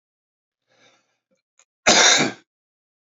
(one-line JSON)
{"cough_length": "3.2 s", "cough_amplitude": 30588, "cough_signal_mean_std_ratio": 0.3, "survey_phase": "beta (2021-08-13 to 2022-03-07)", "age": "45-64", "gender": "Male", "wearing_mask": "No", "symptom_cough_any": true, "symptom_runny_or_blocked_nose": true, "symptom_fever_high_temperature": true, "symptom_change_to_sense_of_smell_or_taste": true, "symptom_loss_of_taste": true, "symptom_other": true, "symptom_onset": "3 days", "smoker_status": "Never smoked", "respiratory_condition_asthma": false, "respiratory_condition_other": false, "recruitment_source": "Test and Trace", "submission_delay": "1 day", "covid_test_result": "Positive", "covid_test_method": "RT-qPCR", "covid_ct_value": 15.4, "covid_ct_gene": "ORF1ab gene", "covid_ct_mean": 15.9, "covid_viral_load": "6300000 copies/ml", "covid_viral_load_category": "High viral load (>1M copies/ml)"}